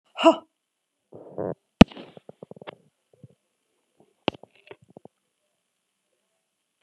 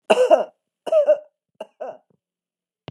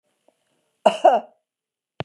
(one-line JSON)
{"exhalation_length": "6.8 s", "exhalation_amplitude": 32768, "exhalation_signal_mean_std_ratio": 0.13, "three_cough_length": "2.9 s", "three_cough_amplitude": 29849, "three_cough_signal_mean_std_ratio": 0.38, "cough_length": "2.0 s", "cough_amplitude": 29740, "cough_signal_mean_std_ratio": 0.27, "survey_phase": "beta (2021-08-13 to 2022-03-07)", "age": "65+", "gender": "Female", "wearing_mask": "No", "symptom_none": true, "smoker_status": "Never smoked", "respiratory_condition_asthma": false, "respiratory_condition_other": false, "recruitment_source": "REACT", "submission_delay": "1 day", "covid_test_result": "Positive", "covid_test_method": "RT-qPCR", "covid_ct_value": 31.0, "covid_ct_gene": "E gene", "influenza_a_test_result": "Negative", "influenza_b_test_result": "Negative"}